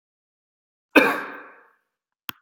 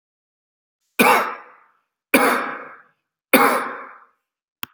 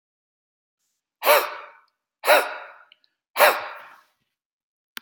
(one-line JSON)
{"cough_length": "2.4 s", "cough_amplitude": 28152, "cough_signal_mean_std_ratio": 0.24, "three_cough_length": "4.7 s", "three_cough_amplitude": 32768, "three_cough_signal_mean_std_ratio": 0.38, "exhalation_length": "5.0 s", "exhalation_amplitude": 25600, "exhalation_signal_mean_std_ratio": 0.3, "survey_phase": "beta (2021-08-13 to 2022-03-07)", "age": "45-64", "gender": "Male", "wearing_mask": "No", "symptom_headache": true, "symptom_onset": "12 days", "smoker_status": "Ex-smoker", "respiratory_condition_asthma": false, "respiratory_condition_other": false, "recruitment_source": "REACT", "submission_delay": "1 day", "covid_test_result": "Negative", "covid_test_method": "RT-qPCR", "influenza_a_test_result": "Negative", "influenza_b_test_result": "Negative"}